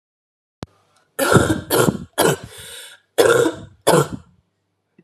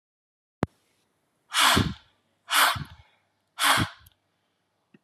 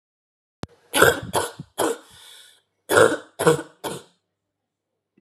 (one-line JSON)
{"cough_length": "5.0 s", "cough_amplitude": 31929, "cough_signal_mean_std_ratio": 0.44, "exhalation_length": "5.0 s", "exhalation_amplitude": 15304, "exhalation_signal_mean_std_ratio": 0.35, "three_cough_length": "5.2 s", "three_cough_amplitude": 32768, "three_cough_signal_mean_std_ratio": 0.34, "survey_phase": "alpha (2021-03-01 to 2021-08-12)", "age": "18-44", "gender": "Female", "wearing_mask": "No", "symptom_cough_any": true, "symptom_new_continuous_cough": true, "symptom_fatigue": true, "symptom_headache": true, "symptom_onset": "3 days", "smoker_status": "Never smoked", "respiratory_condition_asthma": false, "respiratory_condition_other": false, "recruitment_source": "Test and Trace", "submission_delay": "1 day", "covid_test_result": "Positive", "covid_test_method": "RT-qPCR", "covid_ct_value": 18.2, "covid_ct_gene": "ORF1ab gene", "covid_ct_mean": 18.8, "covid_viral_load": "690000 copies/ml", "covid_viral_load_category": "Low viral load (10K-1M copies/ml)"}